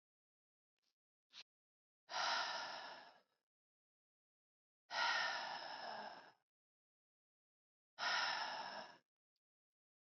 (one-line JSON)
{"exhalation_length": "10.1 s", "exhalation_amplitude": 1481, "exhalation_signal_mean_std_ratio": 0.42, "survey_phase": "beta (2021-08-13 to 2022-03-07)", "age": "18-44", "gender": "Female", "wearing_mask": "No", "symptom_cough_any": true, "symptom_runny_or_blocked_nose": true, "symptom_sore_throat": true, "symptom_fatigue": true, "symptom_headache": true, "symptom_loss_of_taste": true, "smoker_status": "Never smoked", "respiratory_condition_asthma": false, "respiratory_condition_other": false, "recruitment_source": "Test and Trace", "submission_delay": "2 days", "covid_test_result": "Positive", "covid_test_method": "RT-qPCR"}